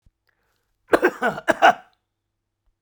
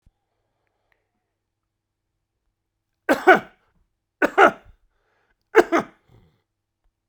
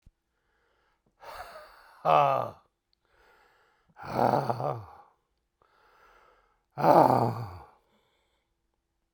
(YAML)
cough_length: 2.8 s
cough_amplitude: 32767
cough_signal_mean_std_ratio: 0.29
three_cough_length: 7.1 s
three_cough_amplitude: 32767
three_cough_signal_mean_std_ratio: 0.22
exhalation_length: 9.1 s
exhalation_amplitude: 20430
exhalation_signal_mean_std_ratio: 0.31
survey_phase: beta (2021-08-13 to 2022-03-07)
age: 65+
gender: Male
wearing_mask: 'No'
symptom_none: true
symptom_onset: 5 days
smoker_status: Ex-smoker
respiratory_condition_asthma: false
respiratory_condition_other: false
recruitment_source: REACT
submission_delay: 0 days
covid_test_result: Negative
covid_test_method: RT-qPCR
influenza_a_test_result: Negative
influenza_b_test_result: Negative